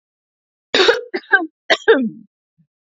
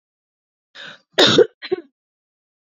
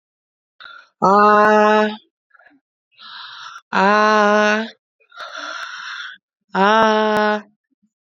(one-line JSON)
{"three_cough_length": "2.8 s", "three_cough_amplitude": 30058, "three_cough_signal_mean_std_ratio": 0.39, "cough_length": "2.7 s", "cough_amplitude": 29978, "cough_signal_mean_std_ratio": 0.28, "exhalation_length": "8.1 s", "exhalation_amplitude": 29482, "exhalation_signal_mean_std_ratio": 0.45, "survey_phase": "beta (2021-08-13 to 2022-03-07)", "age": "18-44", "gender": "Female", "wearing_mask": "No", "symptom_runny_or_blocked_nose": true, "smoker_status": "Never smoked", "respiratory_condition_asthma": false, "respiratory_condition_other": false, "recruitment_source": "REACT", "submission_delay": "3 days", "covid_test_result": "Negative", "covid_test_method": "RT-qPCR", "influenza_a_test_result": "Negative", "influenza_b_test_result": "Negative"}